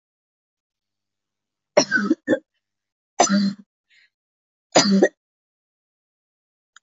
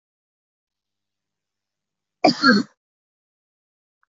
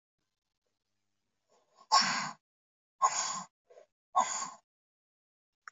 {"three_cough_length": "6.8 s", "three_cough_amplitude": 25782, "three_cough_signal_mean_std_ratio": 0.31, "cough_length": "4.1 s", "cough_amplitude": 27406, "cough_signal_mean_std_ratio": 0.21, "exhalation_length": "5.7 s", "exhalation_amplitude": 8180, "exhalation_signal_mean_std_ratio": 0.31, "survey_phase": "beta (2021-08-13 to 2022-03-07)", "age": "18-44", "gender": "Female", "wearing_mask": "Yes", "symptom_cough_any": true, "symptom_runny_or_blocked_nose": true, "symptom_fatigue": true, "symptom_fever_high_temperature": true, "symptom_change_to_sense_of_smell_or_taste": true, "symptom_loss_of_taste": true, "symptom_onset": "3 days", "smoker_status": "Never smoked", "respiratory_condition_asthma": false, "respiratory_condition_other": false, "recruitment_source": "Test and Trace", "submission_delay": "2 days", "covid_test_result": "Positive", "covid_test_method": "RT-qPCR", "covid_ct_value": 16.3, "covid_ct_gene": "N gene", "covid_ct_mean": 17.0, "covid_viral_load": "2600000 copies/ml", "covid_viral_load_category": "High viral load (>1M copies/ml)"}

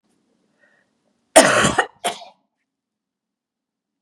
{"cough_length": "4.0 s", "cough_amplitude": 32768, "cough_signal_mean_std_ratio": 0.26, "survey_phase": "beta (2021-08-13 to 2022-03-07)", "age": "45-64", "gender": "Male", "wearing_mask": "No", "symptom_cough_any": true, "symptom_runny_or_blocked_nose": true, "symptom_fatigue": true, "symptom_headache": true, "symptom_other": true, "symptom_onset": "7 days", "smoker_status": "Never smoked", "respiratory_condition_asthma": false, "respiratory_condition_other": false, "recruitment_source": "Test and Trace", "submission_delay": "2 days", "covid_test_result": "Positive", "covid_test_method": "RT-qPCR", "covid_ct_value": 20.3, "covid_ct_gene": "N gene"}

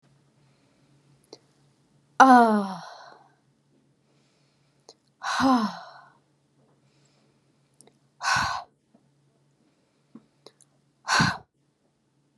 {"exhalation_length": "12.4 s", "exhalation_amplitude": 29420, "exhalation_signal_mean_std_ratio": 0.26, "survey_phase": "beta (2021-08-13 to 2022-03-07)", "age": "18-44", "gender": "Female", "wearing_mask": "No", "symptom_none": true, "symptom_onset": "10 days", "smoker_status": "Never smoked", "respiratory_condition_asthma": false, "respiratory_condition_other": false, "recruitment_source": "REACT", "submission_delay": "2 days", "covid_test_result": "Negative", "covid_test_method": "RT-qPCR", "influenza_a_test_result": "Negative", "influenza_b_test_result": "Negative"}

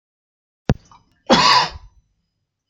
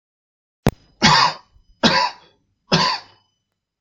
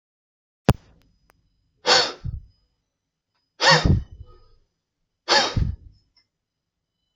{"cough_length": "2.7 s", "cough_amplitude": 31589, "cough_signal_mean_std_ratio": 0.33, "three_cough_length": "3.8 s", "three_cough_amplitude": 32767, "three_cough_signal_mean_std_ratio": 0.38, "exhalation_length": "7.2 s", "exhalation_amplitude": 28618, "exhalation_signal_mean_std_ratio": 0.31, "survey_phase": "beta (2021-08-13 to 2022-03-07)", "age": "18-44", "gender": "Male", "wearing_mask": "No", "symptom_none": true, "smoker_status": "Never smoked", "respiratory_condition_asthma": false, "respiratory_condition_other": false, "recruitment_source": "Test and Trace", "submission_delay": "0 days", "covid_test_result": "Negative", "covid_test_method": "LFT"}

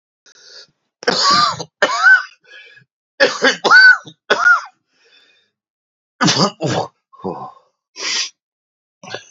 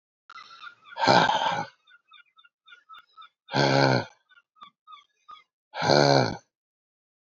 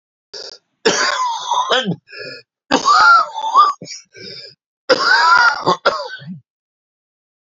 {"three_cough_length": "9.3 s", "three_cough_amplitude": 31065, "three_cough_signal_mean_std_ratio": 0.43, "exhalation_length": "7.3 s", "exhalation_amplitude": 21261, "exhalation_signal_mean_std_ratio": 0.38, "cough_length": "7.6 s", "cough_amplitude": 31579, "cough_signal_mean_std_ratio": 0.53, "survey_phase": "beta (2021-08-13 to 2022-03-07)", "age": "65+", "gender": "Male", "wearing_mask": "Yes", "symptom_cough_any": true, "symptom_shortness_of_breath": true, "symptom_sore_throat": true, "symptom_fatigue": true, "symptom_fever_high_temperature": true, "symptom_headache": true, "symptom_change_to_sense_of_smell_or_taste": true, "symptom_loss_of_taste": true, "symptom_onset": "4 days", "smoker_status": "Ex-smoker", "respiratory_condition_asthma": false, "respiratory_condition_other": false, "recruitment_source": "Test and Trace", "submission_delay": "2 days", "covid_test_result": "Positive", "covid_test_method": "RT-qPCR", "covid_ct_value": 30.9, "covid_ct_gene": "ORF1ab gene"}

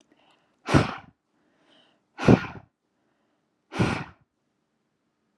{"exhalation_length": "5.4 s", "exhalation_amplitude": 21953, "exhalation_signal_mean_std_ratio": 0.24, "survey_phase": "alpha (2021-03-01 to 2021-08-12)", "age": "18-44", "gender": "Female", "wearing_mask": "No", "symptom_none": true, "smoker_status": "Never smoked", "respiratory_condition_asthma": false, "respiratory_condition_other": false, "recruitment_source": "REACT", "submission_delay": "1 day", "covid_test_result": "Negative", "covid_test_method": "RT-qPCR"}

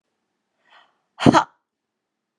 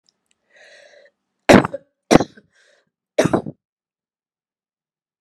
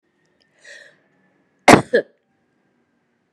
{"exhalation_length": "2.4 s", "exhalation_amplitude": 32767, "exhalation_signal_mean_std_ratio": 0.2, "three_cough_length": "5.2 s", "three_cough_amplitude": 32768, "three_cough_signal_mean_std_ratio": 0.21, "cough_length": "3.3 s", "cough_amplitude": 32768, "cough_signal_mean_std_ratio": 0.19, "survey_phase": "beta (2021-08-13 to 2022-03-07)", "age": "45-64", "gender": "Female", "wearing_mask": "No", "symptom_sore_throat": true, "smoker_status": "Never smoked", "respiratory_condition_asthma": false, "respiratory_condition_other": false, "recruitment_source": "REACT", "submission_delay": "2 days", "covid_test_result": "Negative", "covid_test_method": "RT-qPCR"}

